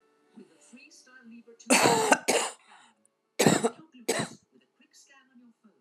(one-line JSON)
{"cough_length": "5.8 s", "cough_amplitude": 19525, "cough_signal_mean_std_ratio": 0.36, "survey_phase": "beta (2021-08-13 to 2022-03-07)", "age": "45-64", "gender": "Female", "wearing_mask": "No", "symptom_none": true, "smoker_status": "Current smoker (11 or more cigarettes per day)", "respiratory_condition_asthma": false, "respiratory_condition_other": false, "recruitment_source": "REACT", "submission_delay": "2 days", "covid_test_result": "Negative", "covid_test_method": "RT-qPCR", "influenza_a_test_result": "Negative", "influenza_b_test_result": "Negative"}